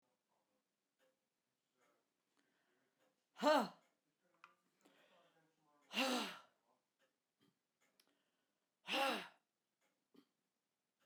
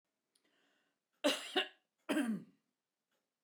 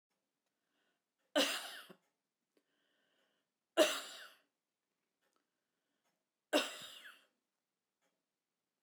exhalation_length: 11.1 s
exhalation_amplitude: 2515
exhalation_signal_mean_std_ratio: 0.23
cough_length: 3.4 s
cough_amplitude: 3671
cough_signal_mean_std_ratio: 0.34
three_cough_length: 8.8 s
three_cough_amplitude: 4911
three_cough_signal_mean_std_ratio: 0.22
survey_phase: beta (2021-08-13 to 2022-03-07)
age: 65+
gender: Female
wearing_mask: 'No'
symptom_cough_any: true
symptom_sore_throat: true
smoker_status: Never smoked
respiratory_condition_asthma: false
respiratory_condition_other: false
recruitment_source: Test and Trace
submission_delay: 1 day
covid_test_method: RT-qPCR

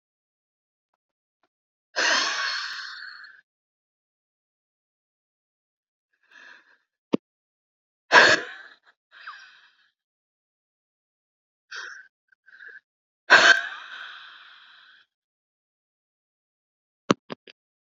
exhalation_length: 17.8 s
exhalation_amplitude: 27514
exhalation_signal_mean_std_ratio: 0.22
survey_phase: beta (2021-08-13 to 2022-03-07)
age: 45-64
gender: Female
wearing_mask: 'No'
symptom_cough_any: true
symptom_shortness_of_breath: true
symptom_abdominal_pain: true
symptom_fatigue: true
symptom_fever_high_temperature: true
symptom_headache: true
symptom_change_to_sense_of_smell_or_taste: true
symptom_onset: 3 days
smoker_status: Never smoked
respiratory_condition_asthma: false
respiratory_condition_other: false
recruitment_source: Test and Trace
submission_delay: 1 day
covid_test_result: Positive
covid_test_method: RT-qPCR
covid_ct_value: 23.1
covid_ct_gene: N gene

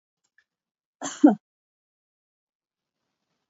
cough_length: 3.5 s
cough_amplitude: 21935
cough_signal_mean_std_ratio: 0.15
survey_phase: beta (2021-08-13 to 2022-03-07)
age: 65+
gender: Female
wearing_mask: 'No'
symptom_none: true
smoker_status: Never smoked
respiratory_condition_asthma: false
respiratory_condition_other: false
recruitment_source: REACT
submission_delay: 2 days
covid_test_result: Negative
covid_test_method: RT-qPCR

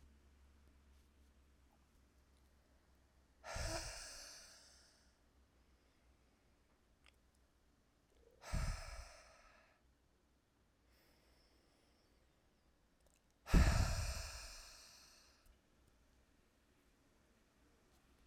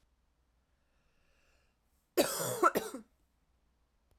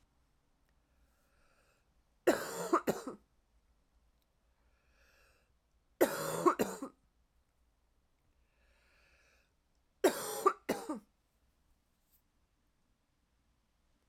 exhalation_length: 18.3 s
exhalation_amplitude: 3773
exhalation_signal_mean_std_ratio: 0.25
cough_length: 4.2 s
cough_amplitude: 7123
cough_signal_mean_std_ratio: 0.28
three_cough_length: 14.1 s
three_cough_amplitude: 6492
three_cough_signal_mean_std_ratio: 0.25
survey_phase: beta (2021-08-13 to 2022-03-07)
age: 18-44
gender: Female
wearing_mask: 'No'
symptom_cough_any: true
symptom_runny_or_blocked_nose: true
symptom_sore_throat: true
symptom_fever_high_temperature: true
symptom_headache: true
symptom_change_to_sense_of_smell_or_taste: true
symptom_onset: 3 days
smoker_status: Never smoked
respiratory_condition_asthma: false
respiratory_condition_other: false
recruitment_source: Test and Trace
submission_delay: 2 days
covid_test_result: Positive
covid_test_method: RT-qPCR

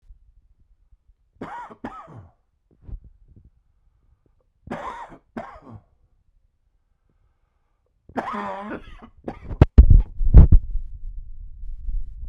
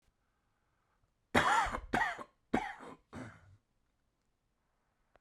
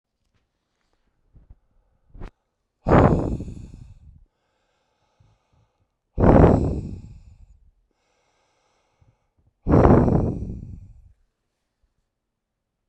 three_cough_length: 12.3 s
three_cough_amplitude: 32768
three_cough_signal_mean_std_ratio: 0.26
cough_length: 5.2 s
cough_amplitude: 7174
cough_signal_mean_std_ratio: 0.33
exhalation_length: 12.9 s
exhalation_amplitude: 32768
exhalation_signal_mean_std_ratio: 0.31
survey_phase: beta (2021-08-13 to 2022-03-07)
age: 45-64
gender: Male
wearing_mask: 'No'
symptom_cough_any: true
symptom_sore_throat: true
symptom_abdominal_pain: true
symptom_fatigue: true
symptom_fever_high_temperature: true
symptom_headache: true
symptom_change_to_sense_of_smell_or_taste: true
symptom_loss_of_taste: true
symptom_onset: 2 days
smoker_status: Never smoked
respiratory_condition_asthma: false
respiratory_condition_other: false
recruitment_source: Test and Trace
submission_delay: 1 day
covid_test_result: Positive
covid_test_method: RT-qPCR
covid_ct_value: 26.2
covid_ct_gene: ORF1ab gene
covid_ct_mean: 26.7
covid_viral_load: 1800 copies/ml
covid_viral_load_category: Minimal viral load (< 10K copies/ml)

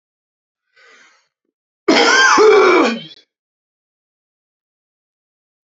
cough_length: 5.6 s
cough_amplitude: 32768
cough_signal_mean_std_ratio: 0.38
survey_phase: beta (2021-08-13 to 2022-03-07)
age: 45-64
gender: Male
wearing_mask: 'No'
symptom_cough_any: true
symptom_fatigue: true
symptom_other: true
symptom_onset: 8 days
smoker_status: Never smoked
respiratory_condition_asthma: false
respiratory_condition_other: false
recruitment_source: REACT
submission_delay: 1 day
covid_test_result: Negative
covid_test_method: RT-qPCR
influenza_a_test_result: Negative
influenza_b_test_result: Negative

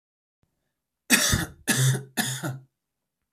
three_cough_length: 3.3 s
three_cough_amplitude: 20054
three_cough_signal_mean_std_ratio: 0.44
survey_phase: beta (2021-08-13 to 2022-03-07)
age: 18-44
gender: Male
wearing_mask: 'No'
symptom_none: true
smoker_status: Never smoked
respiratory_condition_asthma: true
respiratory_condition_other: false
recruitment_source: REACT
submission_delay: 1 day
covid_test_result: Negative
covid_test_method: RT-qPCR
influenza_a_test_result: Negative
influenza_b_test_result: Negative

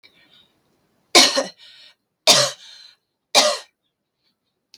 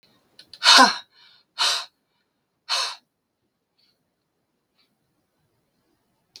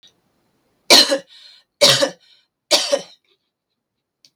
three_cough_length: 4.8 s
three_cough_amplitude: 32768
three_cough_signal_mean_std_ratio: 0.3
exhalation_length: 6.4 s
exhalation_amplitude: 32766
exhalation_signal_mean_std_ratio: 0.24
cough_length: 4.4 s
cough_amplitude: 32768
cough_signal_mean_std_ratio: 0.32
survey_phase: beta (2021-08-13 to 2022-03-07)
age: 45-64
gender: Female
wearing_mask: 'No'
symptom_none: true
symptom_onset: 12 days
smoker_status: Never smoked
respiratory_condition_asthma: false
respiratory_condition_other: false
recruitment_source: REACT
submission_delay: 1 day
covid_test_result: Negative
covid_test_method: RT-qPCR
influenza_a_test_result: Negative
influenza_b_test_result: Negative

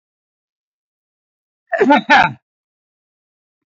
cough_length: 3.7 s
cough_amplitude: 27483
cough_signal_mean_std_ratio: 0.29
survey_phase: beta (2021-08-13 to 2022-03-07)
age: 65+
gender: Male
wearing_mask: 'No'
symptom_none: true
smoker_status: Ex-smoker
respiratory_condition_asthma: false
respiratory_condition_other: false
recruitment_source: REACT
submission_delay: 1 day
covid_test_result: Negative
covid_test_method: RT-qPCR
influenza_a_test_result: Negative
influenza_b_test_result: Negative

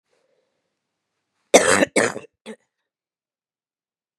cough_length: 4.2 s
cough_amplitude: 32767
cough_signal_mean_std_ratio: 0.24
survey_phase: beta (2021-08-13 to 2022-03-07)
age: 45-64
gender: Female
wearing_mask: 'No'
symptom_new_continuous_cough: true
symptom_runny_or_blocked_nose: true
symptom_shortness_of_breath: true
symptom_fatigue: true
symptom_fever_high_temperature: true
symptom_headache: true
symptom_onset: 3 days
smoker_status: Never smoked
respiratory_condition_asthma: false
respiratory_condition_other: false
recruitment_source: Test and Trace
submission_delay: 1 day
covid_test_result: Positive
covid_test_method: ePCR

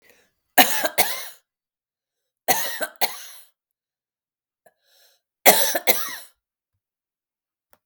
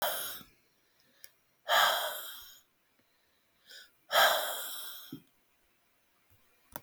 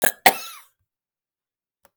three_cough_length: 7.9 s
three_cough_amplitude: 32768
three_cough_signal_mean_std_ratio: 0.3
exhalation_length: 6.8 s
exhalation_amplitude: 8695
exhalation_signal_mean_std_ratio: 0.37
cough_length: 2.0 s
cough_amplitude: 32768
cough_signal_mean_std_ratio: 0.21
survey_phase: beta (2021-08-13 to 2022-03-07)
age: 45-64
gender: Female
wearing_mask: 'No'
symptom_none: true
smoker_status: Never smoked
respiratory_condition_asthma: false
respiratory_condition_other: false
recruitment_source: Test and Trace
submission_delay: 1 day
covid_test_result: Negative
covid_test_method: RT-qPCR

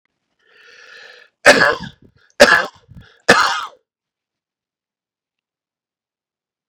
three_cough_length: 6.7 s
three_cough_amplitude: 32768
three_cough_signal_mean_std_ratio: 0.26
survey_phase: beta (2021-08-13 to 2022-03-07)
age: 18-44
gender: Male
wearing_mask: 'No'
symptom_none: true
smoker_status: Never smoked
recruitment_source: REACT
submission_delay: 2 days
covid_test_result: Negative
covid_test_method: RT-qPCR
influenza_a_test_result: Unknown/Void
influenza_b_test_result: Unknown/Void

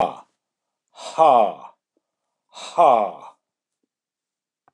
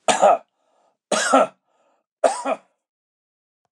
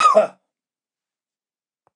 exhalation_length: 4.7 s
exhalation_amplitude: 26730
exhalation_signal_mean_std_ratio: 0.32
three_cough_length: 3.7 s
three_cough_amplitude: 25655
three_cough_signal_mean_std_ratio: 0.37
cough_length: 2.0 s
cough_amplitude: 24255
cough_signal_mean_std_ratio: 0.29
survey_phase: beta (2021-08-13 to 2022-03-07)
age: 65+
gender: Male
wearing_mask: 'No'
symptom_none: true
smoker_status: Never smoked
respiratory_condition_asthma: false
respiratory_condition_other: false
recruitment_source: REACT
submission_delay: 2 days
covid_test_result: Negative
covid_test_method: RT-qPCR
influenza_a_test_result: Negative
influenza_b_test_result: Negative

